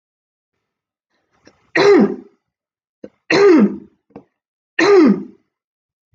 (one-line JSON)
{"three_cough_length": "6.1 s", "three_cough_amplitude": 26779, "three_cough_signal_mean_std_ratio": 0.39, "survey_phase": "beta (2021-08-13 to 2022-03-07)", "age": "45-64", "gender": "Female", "wearing_mask": "No", "symptom_none": true, "smoker_status": "Never smoked", "respiratory_condition_asthma": false, "respiratory_condition_other": false, "recruitment_source": "REACT", "submission_delay": "2 days", "covid_test_result": "Negative", "covid_test_method": "RT-qPCR"}